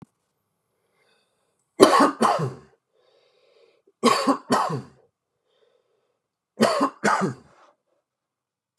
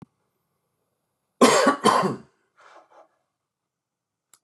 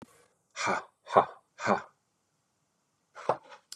{
  "three_cough_length": "8.8 s",
  "three_cough_amplitude": 32768,
  "three_cough_signal_mean_std_ratio": 0.34,
  "cough_length": "4.4 s",
  "cough_amplitude": 25634,
  "cough_signal_mean_std_ratio": 0.3,
  "exhalation_length": "3.8 s",
  "exhalation_amplitude": 20247,
  "exhalation_signal_mean_std_ratio": 0.29,
  "survey_phase": "beta (2021-08-13 to 2022-03-07)",
  "age": "45-64",
  "gender": "Male",
  "wearing_mask": "No",
  "symptom_shortness_of_breath": true,
  "symptom_fatigue": true,
  "symptom_change_to_sense_of_smell_or_taste": true,
  "smoker_status": "Ex-smoker",
  "respiratory_condition_asthma": false,
  "respiratory_condition_other": false,
  "recruitment_source": "Test and Trace",
  "submission_delay": "2 days",
  "covid_test_result": "Positive",
  "covid_test_method": "ePCR"
}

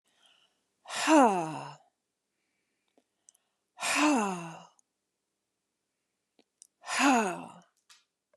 {
  "exhalation_length": "8.4 s",
  "exhalation_amplitude": 11479,
  "exhalation_signal_mean_std_ratio": 0.34,
  "survey_phase": "beta (2021-08-13 to 2022-03-07)",
  "age": "45-64",
  "gender": "Female",
  "wearing_mask": "No",
  "symptom_none": true,
  "smoker_status": "Never smoked",
  "respiratory_condition_asthma": false,
  "respiratory_condition_other": false,
  "recruitment_source": "Test and Trace",
  "submission_delay": "2 days",
  "covid_test_result": "Positive",
  "covid_test_method": "RT-qPCR",
  "covid_ct_value": 35.9,
  "covid_ct_gene": "N gene"
}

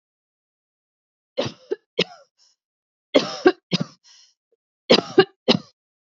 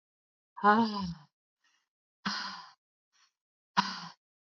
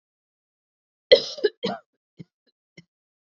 {
  "three_cough_length": "6.1 s",
  "three_cough_amplitude": 32767,
  "three_cough_signal_mean_std_ratio": 0.25,
  "exhalation_length": "4.4 s",
  "exhalation_amplitude": 11590,
  "exhalation_signal_mean_std_ratio": 0.32,
  "cough_length": "3.2 s",
  "cough_amplitude": 32562,
  "cough_signal_mean_std_ratio": 0.19,
  "survey_phase": "beta (2021-08-13 to 2022-03-07)",
  "age": "45-64",
  "gender": "Female",
  "wearing_mask": "Yes",
  "symptom_none": true,
  "smoker_status": "Ex-smoker",
  "respiratory_condition_asthma": false,
  "respiratory_condition_other": false,
  "recruitment_source": "REACT",
  "submission_delay": "19 days",
  "covid_test_result": "Negative",
  "covid_test_method": "RT-qPCR"
}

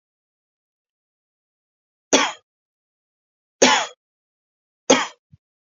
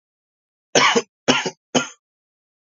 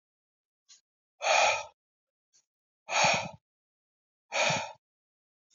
{
  "three_cough_length": "5.6 s",
  "three_cough_amplitude": 29365,
  "three_cough_signal_mean_std_ratio": 0.23,
  "cough_length": "2.6 s",
  "cough_amplitude": 30625,
  "cough_signal_mean_std_ratio": 0.35,
  "exhalation_length": "5.5 s",
  "exhalation_amplitude": 9430,
  "exhalation_signal_mean_std_ratio": 0.36,
  "survey_phase": "beta (2021-08-13 to 2022-03-07)",
  "age": "18-44",
  "gender": "Male",
  "wearing_mask": "No",
  "symptom_cough_any": true,
  "symptom_runny_or_blocked_nose": true,
  "symptom_sore_throat": true,
  "symptom_fatigue": true,
  "symptom_fever_high_temperature": true,
  "smoker_status": "Never smoked",
  "respiratory_condition_asthma": false,
  "respiratory_condition_other": false,
  "recruitment_source": "Test and Trace",
  "submission_delay": "1 day",
  "covid_test_result": "Positive",
  "covid_test_method": "LFT"
}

